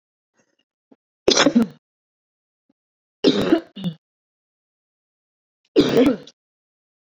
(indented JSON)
{
  "three_cough_length": "7.1 s",
  "three_cough_amplitude": 29291,
  "three_cough_signal_mean_std_ratio": 0.31,
  "survey_phase": "beta (2021-08-13 to 2022-03-07)",
  "age": "18-44",
  "gender": "Female",
  "wearing_mask": "No",
  "symptom_fatigue": true,
  "symptom_onset": "12 days",
  "smoker_status": "Current smoker (e-cigarettes or vapes only)",
  "respiratory_condition_asthma": true,
  "respiratory_condition_other": false,
  "recruitment_source": "REACT",
  "submission_delay": "5 days",
  "covid_test_result": "Negative",
  "covid_test_method": "RT-qPCR"
}